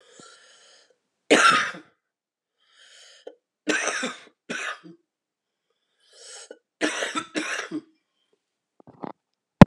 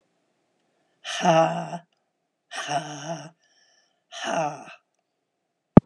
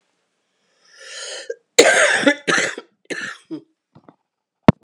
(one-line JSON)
{"three_cough_length": "9.7 s", "three_cough_amplitude": 32768, "three_cough_signal_mean_std_ratio": 0.24, "exhalation_length": "5.9 s", "exhalation_amplitude": 32768, "exhalation_signal_mean_std_ratio": 0.28, "cough_length": "4.8 s", "cough_amplitude": 32768, "cough_signal_mean_std_ratio": 0.34, "survey_phase": "beta (2021-08-13 to 2022-03-07)", "age": "65+", "gender": "Female", "wearing_mask": "No", "symptom_cough_any": true, "symptom_runny_or_blocked_nose": true, "symptom_headache": true, "symptom_onset": "5 days", "smoker_status": "Ex-smoker", "respiratory_condition_asthma": false, "respiratory_condition_other": false, "recruitment_source": "Test and Trace", "submission_delay": "1 day", "covid_test_result": "Positive", "covid_test_method": "RT-qPCR"}